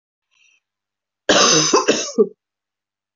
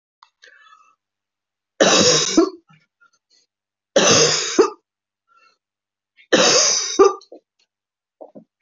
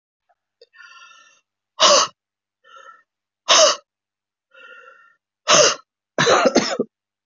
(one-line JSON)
{"cough_length": "3.2 s", "cough_amplitude": 27534, "cough_signal_mean_std_ratio": 0.41, "three_cough_length": "8.6 s", "three_cough_amplitude": 28026, "three_cough_signal_mean_std_ratio": 0.4, "exhalation_length": "7.3 s", "exhalation_amplitude": 29573, "exhalation_signal_mean_std_ratio": 0.35, "survey_phase": "beta (2021-08-13 to 2022-03-07)", "age": "65+", "gender": "Female", "wearing_mask": "No", "symptom_cough_any": true, "symptom_runny_or_blocked_nose": true, "symptom_shortness_of_breath": true, "symptom_sore_throat": true, "symptom_abdominal_pain": true, "symptom_fatigue": true, "symptom_headache": true, "symptom_change_to_sense_of_smell_or_taste": true, "symptom_loss_of_taste": true, "symptom_onset": "6 days", "smoker_status": "Ex-smoker", "respiratory_condition_asthma": false, "respiratory_condition_other": false, "recruitment_source": "Test and Trace", "submission_delay": "1 day", "covid_test_result": "Positive", "covid_test_method": "RT-qPCR", "covid_ct_value": 24.0, "covid_ct_gene": "ORF1ab gene"}